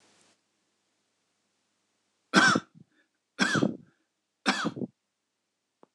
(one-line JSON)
{"three_cough_length": "5.9 s", "three_cough_amplitude": 18359, "three_cough_signal_mean_std_ratio": 0.29, "survey_phase": "beta (2021-08-13 to 2022-03-07)", "age": "45-64", "gender": "Male", "wearing_mask": "No", "symptom_none": true, "smoker_status": "Never smoked", "respiratory_condition_asthma": true, "respiratory_condition_other": false, "recruitment_source": "REACT", "submission_delay": "1 day", "covid_test_result": "Negative", "covid_test_method": "RT-qPCR", "influenza_a_test_result": "Negative", "influenza_b_test_result": "Negative"}